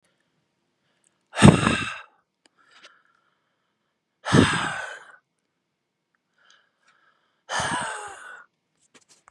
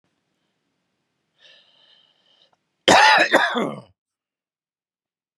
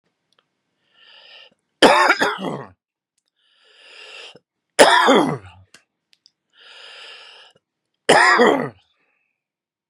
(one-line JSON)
{"exhalation_length": "9.3 s", "exhalation_amplitude": 32768, "exhalation_signal_mean_std_ratio": 0.25, "cough_length": "5.4 s", "cough_amplitude": 32767, "cough_signal_mean_std_ratio": 0.29, "three_cough_length": "9.9 s", "three_cough_amplitude": 32768, "three_cough_signal_mean_std_ratio": 0.33, "survey_phase": "beta (2021-08-13 to 2022-03-07)", "age": "45-64", "gender": "Male", "wearing_mask": "No", "symptom_none": true, "smoker_status": "Never smoked", "respiratory_condition_asthma": false, "respiratory_condition_other": true, "recruitment_source": "REACT", "submission_delay": "1 day", "covid_test_result": "Negative", "covid_test_method": "RT-qPCR", "influenza_a_test_result": "Negative", "influenza_b_test_result": "Negative"}